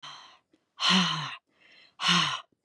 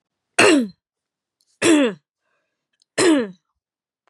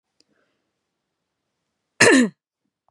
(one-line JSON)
{"exhalation_length": "2.6 s", "exhalation_amplitude": 10139, "exhalation_signal_mean_std_ratio": 0.48, "three_cough_length": "4.1 s", "three_cough_amplitude": 31575, "three_cough_signal_mean_std_ratio": 0.4, "cough_length": "2.9 s", "cough_amplitude": 31432, "cough_signal_mean_std_ratio": 0.25, "survey_phase": "beta (2021-08-13 to 2022-03-07)", "age": "45-64", "gender": "Female", "wearing_mask": "No", "symptom_runny_or_blocked_nose": true, "symptom_fatigue": true, "smoker_status": "Ex-smoker", "respiratory_condition_asthma": false, "respiratory_condition_other": false, "recruitment_source": "Test and Trace", "submission_delay": "1 day", "covid_test_result": "Positive", "covid_test_method": "LFT"}